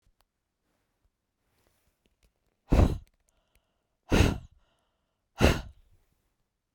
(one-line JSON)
{"exhalation_length": "6.7 s", "exhalation_amplitude": 17659, "exhalation_signal_mean_std_ratio": 0.24, "survey_phase": "beta (2021-08-13 to 2022-03-07)", "age": "45-64", "gender": "Female", "wearing_mask": "No", "symptom_none": true, "smoker_status": "Never smoked", "respiratory_condition_asthma": false, "respiratory_condition_other": false, "recruitment_source": "REACT", "submission_delay": "1 day", "covid_test_result": "Negative", "covid_test_method": "RT-qPCR", "influenza_a_test_result": "Negative", "influenza_b_test_result": "Negative"}